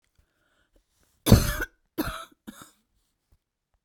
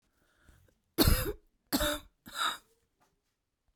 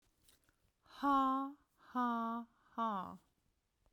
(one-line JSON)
{"cough_length": "3.8 s", "cough_amplitude": 32767, "cough_signal_mean_std_ratio": 0.22, "three_cough_length": "3.8 s", "three_cough_amplitude": 9168, "three_cough_signal_mean_std_ratio": 0.35, "exhalation_length": "3.9 s", "exhalation_amplitude": 2140, "exhalation_signal_mean_std_ratio": 0.5, "survey_phase": "beta (2021-08-13 to 2022-03-07)", "age": "45-64", "gender": "Female", "wearing_mask": "No", "symptom_none": true, "smoker_status": "Ex-smoker", "respiratory_condition_asthma": true, "respiratory_condition_other": false, "recruitment_source": "REACT", "submission_delay": "2 days", "covid_test_result": "Negative", "covid_test_method": "RT-qPCR"}